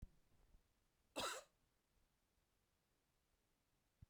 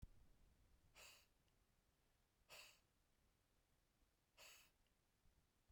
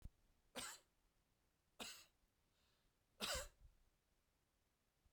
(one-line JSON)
{"cough_length": "4.1 s", "cough_amplitude": 730, "cough_signal_mean_std_ratio": 0.26, "exhalation_length": "5.7 s", "exhalation_amplitude": 181, "exhalation_signal_mean_std_ratio": 0.57, "three_cough_length": "5.1 s", "three_cough_amplitude": 804, "three_cough_signal_mean_std_ratio": 0.32, "survey_phase": "beta (2021-08-13 to 2022-03-07)", "age": "45-64", "gender": "Male", "wearing_mask": "No", "symptom_none": true, "smoker_status": "Ex-smoker", "respiratory_condition_asthma": false, "respiratory_condition_other": false, "recruitment_source": "REACT", "submission_delay": "1 day", "covid_test_result": "Negative", "covid_test_method": "RT-qPCR", "influenza_a_test_result": "Negative", "influenza_b_test_result": "Negative"}